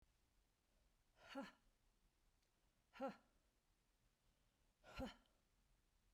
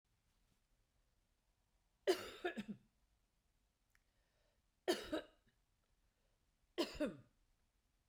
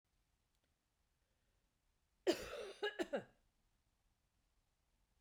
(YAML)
exhalation_length: 6.1 s
exhalation_amplitude: 338
exhalation_signal_mean_std_ratio: 0.32
three_cough_length: 8.1 s
three_cough_amplitude: 2327
three_cough_signal_mean_std_ratio: 0.26
cough_length: 5.2 s
cough_amplitude: 2595
cough_signal_mean_std_ratio: 0.26
survey_phase: beta (2021-08-13 to 2022-03-07)
age: 45-64
gender: Female
wearing_mask: 'No'
symptom_none: true
smoker_status: Ex-smoker
respiratory_condition_asthma: false
respiratory_condition_other: false
recruitment_source: REACT
submission_delay: 1 day
covid_test_result: Negative
covid_test_method: RT-qPCR
influenza_a_test_result: Negative
influenza_b_test_result: Negative